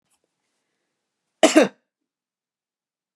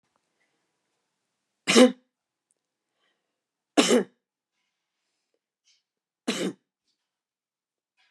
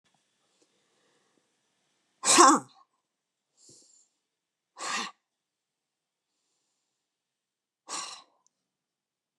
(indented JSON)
{
  "cough_length": "3.2 s",
  "cough_amplitude": 31916,
  "cough_signal_mean_std_ratio": 0.19,
  "three_cough_length": "8.1 s",
  "three_cough_amplitude": 22276,
  "three_cough_signal_mean_std_ratio": 0.2,
  "exhalation_length": "9.4 s",
  "exhalation_amplitude": 19669,
  "exhalation_signal_mean_std_ratio": 0.18,
  "survey_phase": "beta (2021-08-13 to 2022-03-07)",
  "age": "65+",
  "gender": "Female",
  "wearing_mask": "No",
  "symptom_none": true,
  "smoker_status": "Never smoked",
  "respiratory_condition_asthma": false,
  "respiratory_condition_other": false,
  "recruitment_source": "REACT",
  "submission_delay": "2 days",
  "covid_test_result": "Negative",
  "covid_test_method": "RT-qPCR"
}